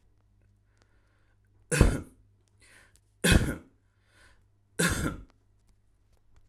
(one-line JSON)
{"three_cough_length": "6.5 s", "three_cough_amplitude": 22595, "three_cough_signal_mean_std_ratio": 0.28, "survey_phase": "alpha (2021-03-01 to 2021-08-12)", "age": "18-44", "gender": "Male", "wearing_mask": "No", "symptom_none": true, "smoker_status": "Current smoker (e-cigarettes or vapes only)", "respiratory_condition_asthma": false, "respiratory_condition_other": false, "recruitment_source": "REACT", "submission_delay": "2 days", "covid_test_result": "Negative", "covid_test_method": "RT-qPCR"}